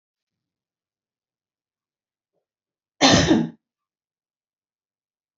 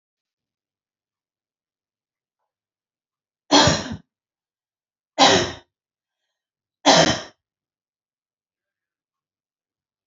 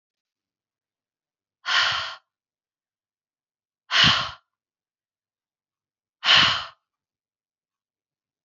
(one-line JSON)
{"cough_length": "5.4 s", "cough_amplitude": 27534, "cough_signal_mean_std_ratio": 0.23, "three_cough_length": "10.1 s", "three_cough_amplitude": 30071, "three_cough_signal_mean_std_ratio": 0.23, "exhalation_length": "8.4 s", "exhalation_amplitude": 20809, "exhalation_signal_mean_std_ratio": 0.28, "survey_phase": "beta (2021-08-13 to 2022-03-07)", "age": "45-64", "gender": "Female", "wearing_mask": "No", "symptom_shortness_of_breath": true, "symptom_headache": true, "smoker_status": "Never smoked", "respiratory_condition_asthma": false, "respiratory_condition_other": false, "recruitment_source": "REACT", "submission_delay": "32 days", "covid_test_result": "Negative", "covid_test_method": "RT-qPCR", "influenza_a_test_result": "Unknown/Void", "influenza_b_test_result": "Unknown/Void"}